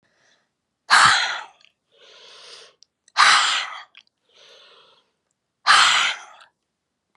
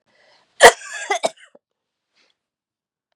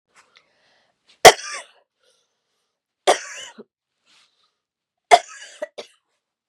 {"exhalation_length": "7.2 s", "exhalation_amplitude": 31207, "exhalation_signal_mean_std_ratio": 0.36, "cough_length": "3.2 s", "cough_amplitude": 32768, "cough_signal_mean_std_ratio": 0.2, "three_cough_length": "6.5 s", "three_cough_amplitude": 32768, "three_cough_signal_mean_std_ratio": 0.16, "survey_phase": "beta (2021-08-13 to 2022-03-07)", "age": "65+", "gender": "Female", "wearing_mask": "No", "symptom_cough_any": true, "symptom_fatigue": true, "symptom_fever_high_temperature": true, "symptom_headache": true, "smoker_status": "Never smoked", "respiratory_condition_asthma": false, "respiratory_condition_other": false, "recruitment_source": "Test and Trace", "submission_delay": "2 days", "covid_test_result": "Positive", "covid_test_method": "RT-qPCR", "covid_ct_value": 30.1, "covid_ct_gene": "ORF1ab gene", "covid_ct_mean": 30.3, "covid_viral_load": "110 copies/ml", "covid_viral_load_category": "Minimal viral load (< 10K copies/ml)"}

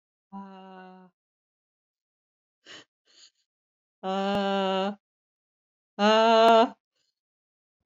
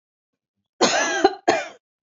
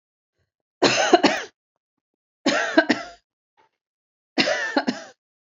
{"exhalation_length": "7.9 s", "exhalation_amplitude": 13680, "exhalation_signal_mean_std_ratio": 0.34, "cough_length": "2.0 s", "cough_amplitude": 28018, "cough_signal_mean_std_ratio": 0.44, "three_cough_length": "5.5 s", "three_cough_amplitude": 27431, "three_cough_signal_mean_std_ratio": 0.38, "survey_phase": "beta (2021-08-13 to 2022-03-07)", "age": "45-64", "gender": "Female", "wearing_mask": "No", "symptom_runny_or_blocked_nose": true, "symptom_fatigue": true, "symptom_headache": true, "symptom_onset": "13 days", "smoker_status": "Never smoked", "respiratory_condition_asthma": true, "respiratory_condition_other": false, "recruitment_source": "REACT", "submission_delay": "2 days", "covid_test_result": "Negative", "covid_test_method": "RT-qPCR", "influenza_a_test_result": "Negative", "influenza_b_test_result": "Negative"}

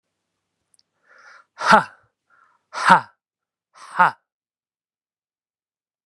{"exhalation_length": "6.1 s", "exhalation_amplitude": 32768, "exhalation_signal_mean_std_ratio": 0.22, "survey_phase": "beta (2021-08-13 to 2022-03-07)", "age": "45-64", "gender": "Male", "wearing_mask": "No", "symptom_cough_any": true, "symptom_runny_or_blocked_nose": true, "symptom_shortness_of_breath": true, "symptom_diarrhoea": true, "symptom_fatigue": true, "symptom_headache": true, "symptom_onset": "4 days", "smoker_status": "Ex-smoker", "respiratory_condition_asthma": false, "respiratory_condition_other": false, "recruitment_source": "Test and Trace", "submission_delay": "2 days", "covid_test_result": "Positive", "covid_test_method": "RT-qPCR", "covid_ct_value": 24.1, "covid_ct_gene": "ORF1ab gene"}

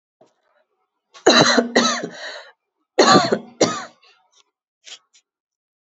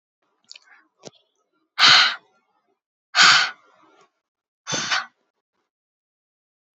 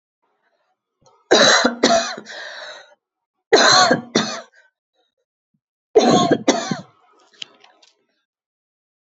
{"cough_length": "5.9 s", "cough_amplitude": 30517, "cough_signal_mean_std_ratio": 0.36, "exhalation_length": "6.7 s", "exhalation_amplitude": 28994, "exhalation_signal_mean_std_ratio": 0.28, "three_cough_length": "9.0 s", "three_cough_amplitude": 32475, "three_cough_signal_mean_std_ratio": 0.39, "survey_phase": "beta (2021-08-13 to 2022-03-07)", "age": "18-44", "gender": "Female", "wearing_mask": "No", "symptom_none": true, "symptom_onset": "8 days", "smoker_status": "Never smoked", "respiratory_condition_asthma": false, "respiratory_condition_other": false, "recruitment_source": "REACT", "submission_delay": "2 days", "covid_test_result": "Negative", "covid_test_method": "RT-qPCR", "influenza_a_test_result": "Negative", "influenza_b_test_result": "Negative"}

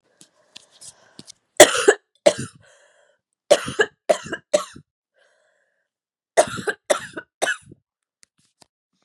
{"three_cough_length": "9.0 s", "three_cough_amplitude": 32768, "three_cough_signal_mean_std_ratio": 0.24, "survey_phase": "beta (2021-08-13 to 2022-03-07)", "age": "18-44", "gender": "Female", "wearing_mask": "No", "symptom_cough_any": true, "symptom_runny_or_blocked_nose": true, "symptom_shortness_of_breath": true, "symptom_sore_throat": true, "symptom_fatigue": true, "symptom_headache": true, "symptom_change_to_sense_of_smell_or_taste": true, "symptom_onset": "3 days", "smoker_status": "Never smoked", "respiratory_condition_asthma": false, "respiratory_condition_other": false, "recruitment_source": "Test and Trace", "submission_delay": "2 days", "covid_test_result": "Positive", "covid_test_method": "RT-qPCR", "covid_ct_value": 22.4, "covid_ct_gene": "N gene"}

